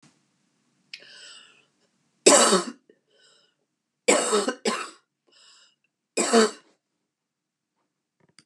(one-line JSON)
{"three_cough_length": "8.5 s", "three_cough_amplitude": 28762, "three_cough_signal_mean_std_ratio": 0.3, "survey_phase": "beta (2021-08-13 to 2022-03-07)", "age": "65+", "gender": "Female", "wearing_mask": "No", "symptom_cough_any": true, "symptom_runny_or_blocked_nose": true, "symptom_shortness_of_breath": true, "symptom_onset": "10 days", "smoker_status": "Never smoked", "respiratory_condition_asthma": false, "respiratory_condition_other": false, "recruitment_source": "REACT", "submission_delay": "3 days", "covid_test_result": "Positive", "covid_test_method": "RT-qPCR", "covid_ct_value": 25.0, "covid_ct_gene": "E gene", "influenza_a_test_result": "Negative", "influenza_b_test_result": "Negative"}